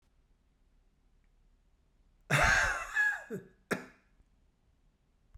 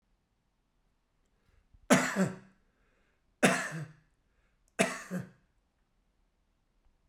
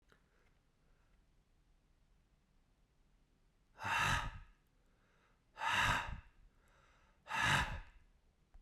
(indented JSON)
{
  "cough_length": "5.4 s",
  "cough_amplitude": 6169,
  "cough_signal_mean_std_ratio": 0.35,
  "three_cough_length": "7.1 s",
  "three_cough_amplitude": 13283,
  "three_cough_signal_mean_std_ratio": 0.28,
  "exhalation_length": "8.6 s",
  "exhalation_amplitude": 2778,
  "exhalation_signal_mean_std_ratio": 0.37,
  "survey_phase": "beta (2021-08-13 to 2022-03-07)",
  "age": "65+",
  "gender": "Male",
  "wearing_mask": "No",
  "symptom_none": true,
  "smoker_status": "Never smoked",
  "respiratory_condition_asthma": false,
  "respiratory_condition_other": false,
  "recruitment_source": "REACT",
  "submission_delay": "1 day",
  "covid_test_result": "Negative",
  "covid_test_method": "RT-qPCR"
}